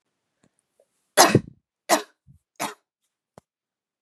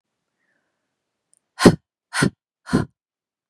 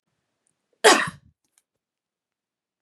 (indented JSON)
{
  "three_cough_length": "4.0 s",
  "three_cough_amplitude": 32768,
  "three_cough_signal_mean_std_ratio": 0.22,
  "exhalation_length": "3.5 s",
  "exhalation_amplitude": 32768,
  "exhalation_signal_mean_std_ratio": 0.22,
  "cough_length": "2.8 s",
  "cough_amplitude": 30341,
  "cough_signal_mean_std_ratio": 0.2,
  "survey_phase": "beta (2021-08-13 to 2022-03-07)",
  "age": "18-44",
  "gender": "Female",
  "wearing_mask": "No",
  "symptom_cough_any": true,
  "symptom_runny_or_blocked_nose": true,
  "symptom_sore_throat": true,
  "symptom_fever_high_temperature": true,
  "symptom_other": true,
  "symptom_onset": "3 days",
  "smoker_status": "Never smoked",
  "respiratory_condition_asthma": false,
  "respiratory_condition_other": false,
  "recruitment_source": "Test and Trace",
  "submission_delay": "2 days",
  "covid_test_result": "Positive",
  "covid_test_method": "ePCR"
}